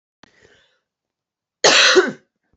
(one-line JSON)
{"cough_length": "2.6 s", "cough_amplitude": 30600, "cough_signal_mean_std_ratio": 0.34, "survey_phase": "beta (2021-08-13 to 2022-03-07)", "age": "18-44", "gender": "Female", "wearing_mask": "No", "symptom_cough_any": true, "symptom_runny_or_blocked_nose": true, "symptom_diarrhoea": true, "symptom_fatigue": true, "symptom_headache": true, "symptom_change_to_sense_of_smell_or_taste": true, "symptom_onset": "2 days", "smoker_status": "Never smoked", "respiratory_condition_asthma": false, "respiratory_condition_other": false, "recruitment_source": "Test and Trace", "submission_delay": "1 day", "covid_test_result": "Positive", "covid_test_method": "RT-qPCR"}